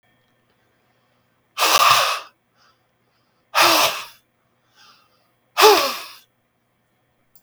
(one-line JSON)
{"exhalation_length": "7.4 s", "exhalation_amplitude": 32768, "exhalation_signal_mean_std_ratio": 0.34, "survey_phase": "beta (2021-08-13 to 2022-03-07)", "age": "45-64", "gender": "Male", "wearing_mask": "No", "symptom_none": true, "smoker_status": "Never smoked", "respiratory_condition_asthma": false, "respiratory_condition_other": false, "recruitment_source": "REACT", "submission_delay": "0 days", "covid_test_method": "RT-qPCR", "influenza_a_test_result": "Unknown/Void", "influenza_b_test_result": "Unknown/Void"}